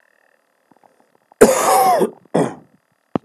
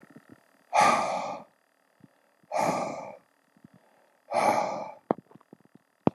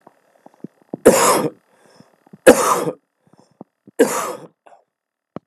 {"cough_length": "3.2 s", "cough_amplitude": 32768, "cough_signal_mean_std_ratio": 0.41, "exhalation_length": "6.1 s", "exhalation_amplitude": 17959, "exhalation_signal_mean_std_ratio": 0.4, "three_cough_length": "5.5 s", "three_cough_amplitude": 32768, "three_cough_signal_mean_std_ratio": 0.33, "survey_phase": "alpha (2021-03-01 to 2021-08-12)", "age": "45-64", "gender": "Male", "wearing_mask": "No", "symptom_cough_any": true, "symptom_shortness_of_breath": true, "symptom_fatigue": true, "symptom_fever_high_temperature": true, "symptom_headache": true, "smoker_status": "Ex-smoker", "respiratory_condition_asthma": false, "respiratory_condition_other": false, "recruitment_source": "Test and Trace", "submission_delay": "1 day", "covid_test_result": "Positive", "covid_test_method": "LFT"}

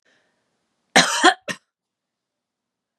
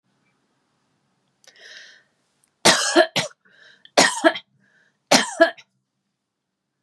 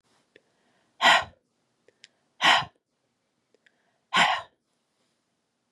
{"cough_length": "3.0 s", "cough_amplitude": 31063, "cough_signal_mean_std_ratio": 0.25, "three_cough_length": "6.8 s", "three_cough_amplitude": 32767, "three_cough_signal_mean_std_ratio": 0.29, "exhalation_length": "5.7 s", "exhalation_amplitude": 19502, "exhalation_signal_mean_std_ratio": 0.27, "survey_phase": "beta (2021-08-13 to 2022-03-07)", "age": "45-64", "gender": "Female", "wearing_mask": "No", "symptom_cough_any": true, "symptom_runny_or_blocked_nose": true, "symptom_headache": true, "symptom_onset": "3 days", "smoker_status": "Never smoked", "respiratory_condition_asthma": false, "respiratory_condition_other": false, "recruitment_source": "Test and Trace", "submission_delay": "2 days", "covid_test_result": "Positive", "covid_test_method": "RT-qPCR", "covid_ct_value": 23.1, "covid_ct_gene": "ORF1ab gene", "covid_ct_mean": 23.6, "covid_viral_load": "18000 copies/ml", "covid_viral_load_category": "Low viral load (10K-1M copies/ml)"}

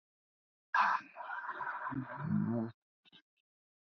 {"exhalation_length": "3.9 s", "exhalation_amplitude": 3950, "exhalation_signal_mean_std_ratio": 0.5, "survey_phase": "beta (2021-08-13 to 2022-03-07)", "age": "18-44", "gender": "Male", "wearing_mask": "No", "symptom_runny_or_blocked_nose": true, "symptom_shortness_of_breath": true, "symptom_fatigue": true, "symptom_fever_high_temperature": true, "symptom_headache": true, "symptom_onset": "5 days", "smoker_status": "Never smoked", "respiratory_condition_asthma": false, "respiratory_condition_other": false, "recruitment_source": "Test and Trace", "submission_delay": "1 day", "covid_test_result": "Positive", "covid_test_method": "RT-qPCR", "covid_ct_value": 18.6, "covid_ct_gene": "ORF1ab gene"}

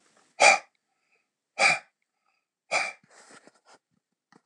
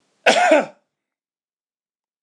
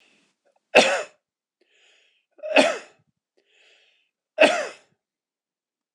{"exhalation_length": "4.5 s", "exhalation_amplitude": 20088, "exhalation_signal_mean_std_ratio": 0.26, "cough_length": "2.2 s", "cough_amplitude": 26028, "cough_signal_mean_std_ratio": 0.34, "three_cough_length": "5.9 s", "three_cough_amplitude": 26028, "three_cough_signal_mean_std_ratio": 0.26, "survey_phase": "alpha (2021-03-01 to 2021-08-12)", "age": "45-64", "gender": "Male", "wearing_mask": "No", "symptom_none": true, "smoker_status": "Ex-smoker", "respiratory_condition_asthma": false, "respiratory_condition_other": false, "recruitment_source": "REACT", "submission_delay": "2 days", "covid_test_result": "Negative", "covid_test_method": "RT-qPCR"}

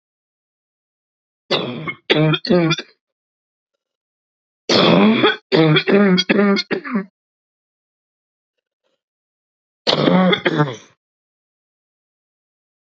{"three_cough_length": "12.9 s", "three_cough_amplitude": 30243, "three_cough_signal_mean_std_ratio": 0.43, "survey_phase": "beta (2021-08-13 to 2022-03-07)", "age": "45-64", "gender": "Female", "wearing_mask": "No", "symptom_cough_any": true, "symptom_runny_or_blocked_nose": true, "symptom_sore_throat": true, "symptom_abdominal_pain": true, "symptom_diarrhoea": true, "symptom_fatigue": true, "symptom_headache": true, "symptom_change_to_sense_of_smell_or_taste": true, "symptom_loss_of_taste": true, "symptom_other": true, "symptom_onset": "3 days", "smoker_status": "Current smoker (1 to 10 cigarettes per day)", "respiratory_condition_asthma": false, "respiratory_condition_other": false, "recruitment_source": "Test and Trace", "submission_delay": "1 day", "covid_test_result": "Positive", "covid_test_method": "RT-qPCR"}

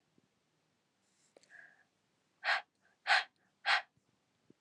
{"exhalation_length": "4.6 s", "exhalation_amplitude": 5748, "exhalation_signal_mean_std_ratio": 0.25, "survey_phase": "alpha (2021-03-01 to 2021-08-12)", "age": "18-44", "gender": "Female", "wearing_mask": "No", "symptom_cough_any": true, "symptom_shortness_of_breath": true, "symptom_headache": true, "symptom_onset": "2 days", "smoker_status": "Never smoked", "respiratory_condition_asthma": false, "respiratory_condition_other": false, "recruitment_source": "Test and Trace", "submission_delay": "1 day", "covid_ct_value": 28.4, "covid_ct_gene": "ORF1ab gene"}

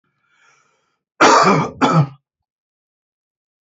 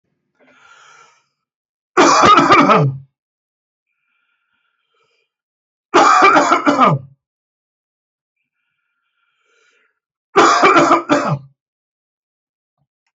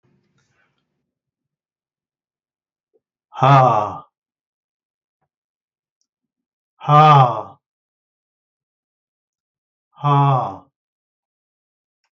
{"cough_length": "3.7 s", "cough_amplitude": 28128, "cough_signal_mean_std_ratio": 0.37, "three_cough_length": "13.1 s", "three_cough_amplitude": 30941, "three_cough_signal_mean_std_ratio": 0.4, "exhalation_length": "12.1 s", "exhalation_amplitude": 32767, "exhalation_signal_mean_std_ratio": 0.28, "survey_phase": "alpha (2021-03-01 to 2021-08-12)", "age": "45-64", "gender": "Male", "wearing_mask": "No", "symptom_none": true, "symptom_cough_any": true, "smoker_status": "Never smoked", "respiratory_condition_asthma": false, "respiratory_condition_other": false, "recruitment_source": "REACT", "submission_delay": "2 days", "covid_test_result": "Negative", "covid_test_method": "RT-qPCR"}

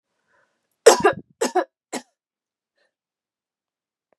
{"three_cough_length": "4.2 s", "three_cough_amplitude": 32768, "three_cough_signal_mean_std_ratio": 0.21, "survey_phase": "beta (2021-08-13 to 2022-03-07)", "age": "45-64", "gender": "Female", "wearing_mask": "No", "symptom_none": true, "smoker_status": "Never smoked", "respiratory_condition_asthma": false, "respiratory_condition_other": false, "recruitment_source": "REACT", "submission_delay": "0 days", "covid_test_result": "Negative", "covid_test_method": "RT-qPCR", "influenza_a_test_result": "Negative", "influenza_b_test_result": "Negative"}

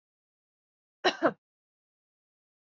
{"cough_length": "2.6 s", "cough_amplitude": 8653, "cough_signal_mean_std_ratio": 0.19, "survey_phase": "beta (2021-08-13 to 2022-03-07)", "age": "45-64", "gender": "Female", "wearing_mask": "No", "symptom_none": true, "smoker_status": "Never smoked", "respiratory_condition_asthma": false, "respiratory_condition_other": false, "recruitment_source": "REACT", "submission_delay": "2 days", "covid_test_result": "Negative", "covid_test_method": "RT-qPCR", "influenza_a_test_result": "Negative", "influenza_b_test_result": "Negative"}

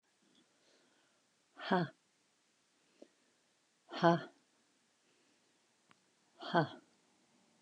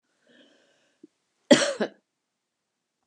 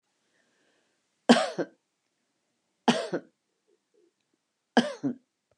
{"exhalation_length": "7.6 s", "exhalation_amplitude": 7173, "exhalation_signal_mean_std_ratio": 0.21, "cough_length": "3.1 s", "cough_amplitude": 27004, "cough_signal_mean_std_ratio": 0.2, "three_cough_length": "5.6 s", "three_cough_amplitude": 23781, "three_cough_signal_mean_std_ratio": 0.24, "survey_phase": "beta (2021-08-13 to 2022-03-07)", "age": "65+", "gender": "Female", "wearing_mask": "No", "symptom_shortness_of_breath": true, "symptom_fatigue": true, "symptom_onset": "12 days", "smoker_status": "Never smoked", "respiratory_condition_asthma": false, "respiratory_condition_other": false, "recruitment_source": "REACT", "submission_delay": "2 days", "covid_test_result": "Negative", "covid_test_method": "RT-qPCR", "influenza_a_test_result": "Negative", "influenza_b_test_result": "Negative"}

